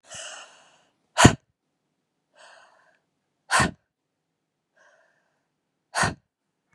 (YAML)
exhalation_length: 6.7 s
exhalation_amplitude: 32768
exhalation_signal_mean_std_ratio: 0.2
survey_phase: beta (2021-08-13 to 2022-03-07)
age: 45-64
gender: Female
wearing_mask: 'No'
symptom_cough_any: true
symptom_new_continuous_cough: true
symptom_runny_or_blocked_nose: true
symptom_sore_throat: true
symptom_headache: true
smoker_status: Never smoked
respiratory_condition_asthma: false
respiratory_condition_other: false
recruitment_source: Test and Trace
submission_delay: 1 day
covid_test_result: Positive
covid_test_method: RT-qPCR
covid_ct_value: 29.5
covid_ct_gene: N gene